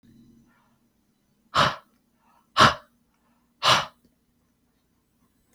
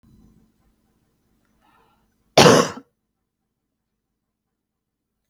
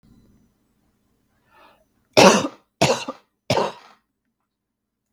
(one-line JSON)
{"exhalation_length": "5.5 s", "exhalation_amplitude": 26415, "exhalation_signal_mean_std_ratio": 0.24, "cough_length": "5.3 s", "cough_amplitude": 32768, "cough_signal_mean_std_ratio": 0.19, "three_cough_length": "5.1 s", "three_cough_amplitude": 32768, "three_cough_signal_mean_std_ratio": 0.27, "survey_phase": "beta (2021-08-13 to 2022-03-07)", "age": "18-44", "gender": "Female", "wearing_mask": "No", "symptom_runny_or_blocked_nose": true, "symptom_onset": "12 days", "smoker_status": "Never smoked", "respiratory_condition_asthma": false, "respiratory_condition_other": false, "recruitment_source": "REACT", "submission_delay": "1 day", "covid_test_result": "Negative", "covid_test_method": "RT-qPCR", "influenza_a_test_result": "Negative", "influenza_b_test_result": "Negative"}